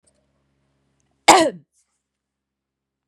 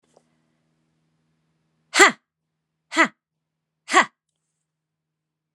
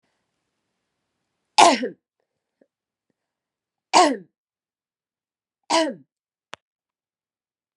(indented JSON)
{
  "cough_length": "3.1 s",
  "cough_amplitude": 32768,
  "cough_signal_mean_std_ratio": 0.2,
  "exhalation_length": "5.5 s",
  "exhalation_amplitude": 32767,
  "exhalation_signal_mean_std_ratio": 0.19,
  "three_cough_length": "7.8 s",
  "three_cough_amplitude": 32768,
  "three_cough_signal_mean_std_ratio": 0.22,
  "survey_phase": "beta (2021-08-13 to 2022-03-07)",
  "age": "45-64",
  "gender": "Female",
  "wearing_mask": "No",
  "symptom_runny_or_blocked_nose": true,
  "symptom_fatigue": true,
  "symptom_change_to_sense_of_smell_or_taste": true,
  "symptom_onset": "5 days",
  "smoker_status": "Never smoked",
  "respiratory_condition_asthma": false,
  "respiratory_condition_other": false,
  "recruitment_source": "Test and Trace",
  "submission_delay": "1 day",
  "covid_test_result": "Positive",
  "covid_test_method": "RT-qPCR"
}